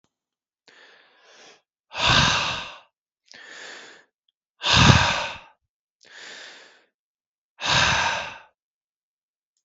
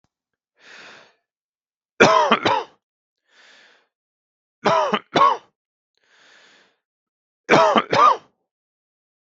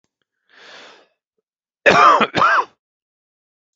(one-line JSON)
{"exhalation_length": "9.6 s", "exhalation_amplitude": 32041, "exhalation_signal_mean_std_ratio": 0.36, "three_cough_length": "9.3 s", "three_cough_amplitude": 32768, "three_cough_signal_mean_std_ratio": 0.33, "cough_length": "3.8 s", "cough_amplitude": 32768, "cough_signal_mean_std_ratio": 0.35, "survey_phase": "beta (2021-08-13 to 2022-03-07)", "age": "45-64", "gender": "Male", "wearing_mask": "No", "symptom_none": true, "smoker_status": "Never smoked", "respiratory_condition_asthma": false, "respiratory_condition_other": false, "recruitment_source": "Test and Trace", "submission_delay": "0 days", "covid_test_result": "Negative", "covid_test_method": "LFT"}